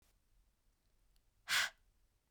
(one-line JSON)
{"exhalation_length": "2.3 s", "exhalation_amplitude": 3252, "exhalation_signal_mean_std_ratio": 0.25, "survey_phase": "beta (2021-08-13 to 2022-03-07)", "age": "18-44", "gender": "Female", "wearing_mask": "No", "symptom_other": true, "symptom_onset": "7 days", "smoker_status": "Ex-smoker", "respiratory_condition_asthma": true, "respiratory_condition_other": false, "recruitment_source": "REACT", "submission_delay": "1 day", "covid_test_result": "Negative", "covid_test_method": "RT-qPCR", "influenza_a_test_result": "Unknown/Void", "influenza_b_test_result": "Unknown/Void"}